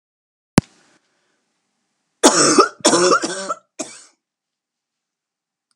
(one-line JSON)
{"cough_length": "5.8 s", "cough_amplitude": 32768, "cough_signal_mean_std_ratio": 0.32, "survey_phase": "beta (2021-08-13 to 2022-03-07)", "age": "45-64", "gender": "Female", "wearing_mask": "No", "symptom_cough_any": true, "symptom_new_continuous_cough": true, "symptom_runny_or_blocked_nose": true, "symptom_fatigue": true, "symptom_headache": true, "symptom_onset": "9 days", "smoker_status": "Never smoked", "respiratory_condition_asthma": false, "respiratory_condition_other": false, "recruitment_source": "Test and Trace", "submission_delay": "2 days", "covid_test_result": "Positive", "covid_test_method": "RT-qPCR", "covid_ct_value": 17.7, "covid_ct_gene": "ORF1ab gene", "covid_ct_mean": 18.2, "covid_viral_load": "1100000 copies/ml", "covid_viral_load_category": "High viral load (>1M copies/ml)"}